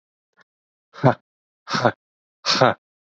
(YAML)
exhalation_length: 3.2 s
exhalation_amplitude: 27623
exhalation_signal_mean_std_ratio: 0.3
survey_phase: beta (2021-08-13 to 2022-03-07)
age: 18-44
gender: Male
wearing_mask: 'No'
symptom_cough_any: true
symptom_runny_or_blocked_nose: true
symptom_sore_throat: true
symptom_fatigue: true
smoker_status: Never smoked
respiratory_condition_asthma: false
respiratory_condition_other: false
recruitment_source: Test and Trace
submission_delay: 1 day
covid_test_result: Positive
covid_test_method: RT-qPCR
covid_ct_value: 27.0
covid_ct_gene: N gene